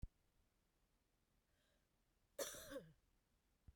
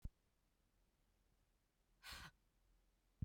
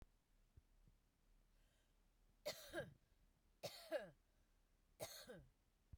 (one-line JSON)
{"cough_length": "3.8 s", "cough_amplitude": 820, "cough_signal_mean_std_ratio": 0.31, "exhalation_length": "3.2 s", "exhalation_amplitude": 786, "exhalation_signal_mean_std_ratio": 0.25, "three_cough_length": "6.0 s", "three_cough_amplitude": 556, "three_cough_signal_mean_std_ratio": 0.39, "survey_phase": "beta (2021-08-13 to 2022-03-07)", "age": "45-64", "gender": "Female", "wearing_mask": "No", "symptom_fatigue": true, "symptom_onset": "12 days", "smoker_status": "Never smoked", "respiratory_condition_asthma": true, "respiratory_condition_other": false, "recruitment_source": "REACT", "submission_delay": "0 days", "covid_test_result": "Negative", "covid_test_method": "RT-qPCR"}